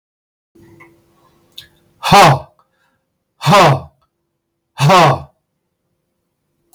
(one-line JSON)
{"exhalation_length": "6.7 s", "exhalation_amplitude": 32766, "exhalation_signal_mean_std_ratio": 0.36, "survey_phase": "beta (2021-08-13 to 2022-03-07)", "age": "65+", "gender": "Male", "wearing_mask": "No", "symptom_cough_any": true, "symptom_shortness_of_breath": true, "symptom_sore_throat": true, "symptom_fatigue": true, "smoker_status": "Ex-smoker", "respiratory_condition_asthma": true, "respiratory_condition_other": false, "recruitment_source": "REACT", "submission_delay": "12 days", "covid_test_result": "Negative", "covid_test_method": "RT-qPCR", "influenza_a_test_result": "Negative", "influenza_b_test_result": "Negative"}